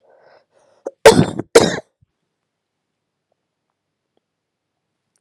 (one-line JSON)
{"cough_length": "5.2 s", "cough_amplitude": 32768, "cough_signal_mean_std_ratio": 0.21, "survey_phase": "beta (2021-08-13 to 2022-03-07)", "age": "18-44", "gender": "Female", "wearing_mask": "No", "symptom_cough_any": true, "symptom_runny_or_blocked_nose": true, "symptom_shortness_of_breath": true, "symptom_fatigue": true, "symptom_fever_high_temperature": true, "symptom_headache": true, "symptom_change_to_sense_of_smell_or_taste": true, "symptom_loss_of_taste": true, "symptom_other": true, "symptom_onset": "2 days", "smoker_status": "Ex-smoker", "respiratory_condition_asthma": false, "respiratory_condition_other": false, "recruitment_source": "Test and Trace", "submission_delay": "2 days", "covid_test_result": "Positive", "covid_test_method": "RT-qPCR", "covid_ct_value": 16.8, "covid_ct_gene": "S gene", "covid_ct_mean": 17.6, "covid_viral_load": "1700000 copies/ml", "covid_viral_load_category": "High viral load (>1M copies/ml)"}